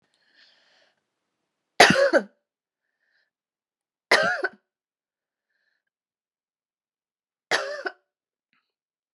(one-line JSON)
{"three_cough_length": "9.1 s", "three_cough_amplitude": 32768, "three_cough_signal_mean_std_ratio": 0.23, "survey_phase": "alpha (2021-03-01 to 2021-08-12)", "age": "45-64", "gender": "Female", "wearing_mask": "No", "symptom_cough_any": true, "symptom_fatigue": true, "symptom_headache": true, "smoker_status": "Never smoked", "respiratory_condition_asthma": false, "respiratory_condition_other": false, "recruitment_source": "Test and Trace", "submission_delay": "1 day", "covid_test_result": "Positive", "covid_test_method": "RT-qPCR", "covid_ct_value": 24.5, "covid_ct_gene": "ORF1ab gene"}